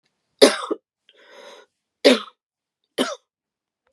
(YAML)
three_cough_length: 3.9 s
three_cough_amplitude: 32767
three_cough_signal_mean_std_ratio: 0.24
survey_phase: beta (2021-08-13 to 2022-03-07)
age: 45-64
gender: Female
wearing_mask: 'No'
symptom_cough_any: true
symptom_new_continuous_cough: true
symptom_runny_or_blocked_nose: true
symptom_sore_throat: true
symptom_fatigue: true
symptom_fever_high_temperature: true
symptom_headache: true
symptom_onset: 3 days
smoker_status: Never smoked
respiratory_condition_asthma: false
respiratory_condition_other: false
recruitment_source: Test and Trace
submission_delay: 2 days
covid_test_result: Positive
covid_test_method: RT-qPCR
covid_ct_value: 24.5
covid_ct_gene: ORF1ab gene
covid_ct_mean: 24.6
covid_viral_load: 8600 copies/ml
covid_viral_load_category: Minimal viral load (< 10K copies/ml)